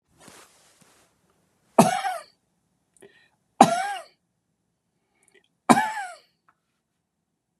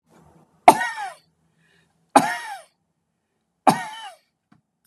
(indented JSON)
{
  "cough_length": "7.6 s",
  "cough_amplitude": 32767,
  "cough_signal_mean_std_ratio": 0.23,
  "three_cough_length": "4.9 s",
  "three_cough_amplitude": 32768,
  "three_cough_signal_mean_std_ratio": 0.23,
  "survey_phase": "beta (2021-08-13 to 2022-03-07)",
  "age": "65+",
  "gender": "Male",
  "wearing_mask": "No",
  "symptom_none": true,
  "smoker_status": "Never smoked",
  "respiratory_condition_asthma": false,
  "respiratory_condition_other": false,
  "recruitment_source": "REACT",
  "submission_delay": "14 days",
  "covid_test_result": "Negative",
  "covid_test_method": "RT-qPCR",
  "influenza_a_test_result": "Negative",
  "influenza_b_test_result": "Negative"
}